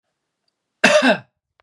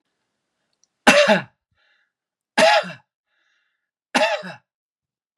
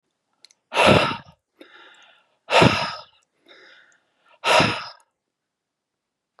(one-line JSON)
{"cough_length": "1.6 s", "cough_amplitude": 32768, "cough_signal_mean_std_ratio": 0.37, "three_cough_length": "5.4 s", "three_cough_amplitude": 32767, "three_cough_signal_mean_std_ratio": 0.32, "exhalation_length": "6.4 s", "exhalation_amplitude": 30068, "exhalation_signal_mean_std_ratio": 0.33, "survey_phase": "beta (2021-08-13 to 2022-03-07)", "age": "45-64", "gender": "Male", "wearing_mask": "No", "symptom_none": true, "smoker_status": "Never smoked", "respiratory_condition_asthma": false, "respiratory_condition_other": false, "recruitment_source": "REACT", "submission_delay": "2 days", "covid_test_result": "Negative", "covid_test_method": "RT-qPCR", "influenza_a_test_result": "Negative", "influenza_b_test_result": "Negative"}